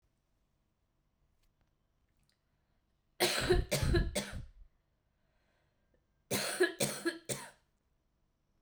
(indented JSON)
{
  "cough_length": "8.6 s",
  "cough_amplitude": 4935,
  "cough_signal_mean_std_ratio": 0.36,
  "survey_phase": "beta (2021-08-13 to 2022-03-07)",
  "age": "18-44",
  "gender": "Female",
  "wearing_mask": "No",
  "symptom_cough_any": true,
  "symptom_sore_throat": true,
  "symptom_headache": true,
  "symptom_change_to_sense_of_smell_or_taste": true,
  "symptom_loss_of_taste": true,
  "symptom_onset": "9 days",
  "smoker_status": "Current smoker (e-cigarettes or vapes only)",
  "respiratory_condition_asthma": false,
  "respiratory_condition_other": false,
  "recruitment_source": "Test and Trace",
  "submission_delay": "2 days",
  "covid_test_result": "Positive",
  "covid_test_method": "RT-qPCR",
  "covid_ct_value": 15.6,
  "covid_ct_gene": "ORF1ab gene",
  "covid_ct_mean": 16.1,
  "covid_viral_load": "5300000 copies/ml",
  "covid_viral_load_category": "High viral load (>1M copies/ml)"
}